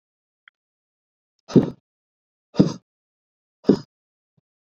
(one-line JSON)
{"exhalation_length": "4.6 s", "exhalation_amplitude": 27859, "exhalation_signal_mean_std_ratio": 0.19, "survey_phase": "beta (2021-08-13 to 2022-03-07)", "age": "18-44", "gender": "Male", "wearing_mask": "No", "symptom_none": true, "symptom_onset": "4 days", "smoker_status": "Never smoked", "respiratory_condition_asthma": false, "respiratory_condition_other": false, "recruitment_source": "REACT", "submission_delay": "1 day", "covid_test_result": "Negative", "covid_test_method": "RT-qPCR"}